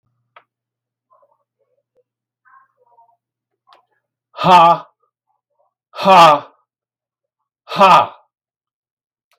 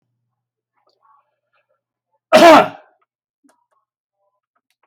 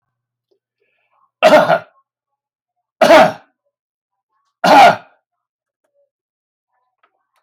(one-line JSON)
{"exhalation_length": "9.4 s", "exhalation_amplitude": 32768, "exhalation_signal_mean_std_ratio": 0.28, "cough_length": "4.9 s", "cough_amplitude": 32026, "cough_signal_mean_std_ratio": 0.23, "three_cough_length": "7.4 s", "three_cough_amplitude": 32768, "three_cough_signal_mean_std_ratio": 0.3, "survey_phase": "beta (2021-08-13 to 2022-03-07)", "age": "65+", "gender": "Male", "wearing_mask": "No", "symptom_none": true, "smoker_status": "Ex-smoker", "respiratory_condition_asthma": false, "respiratory_condition_other": false, "recruitment_source": "REACT", "submission_delay": "2 days", "covid_test_result": "Negative", "covid_test_method": "RT-qPCR"}